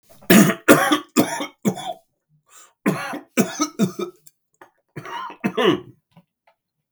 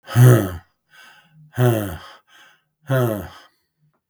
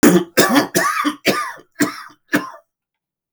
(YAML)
three_cough_length: 6.9 s
three_cough_amplitude: 32768
three_cough_signal_mean_std_ratio: 0.4
exhalation_length: 4.1 s
exhalation_amplitude: 32766
exhalation_signal_mean_std_ratio: 0.38
cough_length: 3.3 s
cough_amplitude: 32593
cough_signal_mean_std_ratio: 0.51
survey_phase: beta (2021-08-13 to 2022-03-07)
age: 45-64
gender: Male
wearing_mask: 'No'
symptom_none: true
smoker_status: Ex-smoker
respiratory_condition_asthma: false
respiratory_condition_other: false
recruitment_source: REACT
submission_delay: 2 days
covid_test_result: Negative
covid_test_method: RT-qPCR
influenza_a_test_result: Negative
influenza_b_test_result: Negative